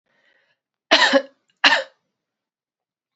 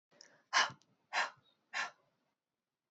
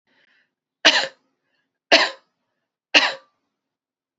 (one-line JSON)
{"cough_length": "3.2 s", "cough_amplitude": 32767, "cough_signal_mean_std_ratio": 0.3, "exhalation_length": "2.9 s", "exhalation_amplitude": 4697, "exhalation_signal_mean_std_ratio": 0.3, "three_cough_length": "4.2 s", "three_cough_amplitude": 31195, "three_cough_signal_mean_std_ratio": 0.26, "survey_phase": "alpha (2021-03-01 to 2021-08-12)", "age": "18-44", "gender": "Female", "wearing_mask": "No", "symptom_headache": true, "symptom_loss_of_taste": true, "smoker_status": "Never smoked", "respiratory_condition_asthma": false, "respiratory_condition_other": false, "recruitment_source": "Test and Trace", "submission_delay": "2 days", "covid_test_result": "Positive", "covid_test_method": "RT-qPCR"}